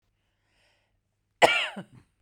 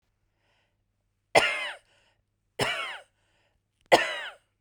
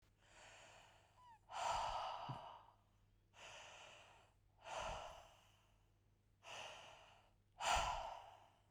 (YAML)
cough_length: 2.2 s
cough_amplitude: 24145
cough_signal_mean_std_ratio: 0.24
three_cough_length: 4.6 s
three_cough_amplitude: 22784
three_cough_signal_mean_std_ratio: 0.29
exhalation_length: 8.7 s
exhalation_amplitude: 1474
exhalation_signal_mean_std_ratio: 0.48
survey_phase: beta (2021-08-13 to 2022-03-07)
age: 45-64
gender: Female
wearing_mask: 'No'
symptom_cough_any: true
symptom_shortness_of_breath: true
symptom_onset: 7 days
smoker_status: Ex-smoker
respiratory_condition_asthma: true
respiratory_condition_other: false
recruitment_source: REACT
submission_delay: 1 day
covid_test_result: Negative
covid_test_method: RT-qPCR